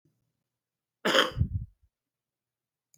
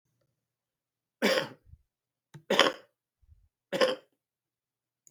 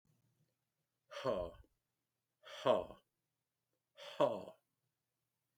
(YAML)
cough_length: 3.0 s
cough_amplitude: 15433
cough_signal_mean_std_ratio: 0.29
three_cough_length: 5.1 s
three_cough_amplitude: 22276
three_cough_signal_mean_std_ratio: 0.27
exhalation_length: 5.6 s
exhalation_amplitude: 3691
exhalation_signal_mean_std_ratio: 0.28
survey_phase: beta (2021-08-13 to 2022-03-07)
age: 65+
gender: Male
wearing_mask: 'No'
symptom_none: true
smoker_status: Never smoked
respiratory_condition_asthma: false
respiratory_condition_other: false
recruitment_source: REACT
submission_delay: 1 day
covid_test_result: Negative
covid_test_method: RT-qPCR
influenza_a_test_result: Negative
influenza_b_test_result: Negative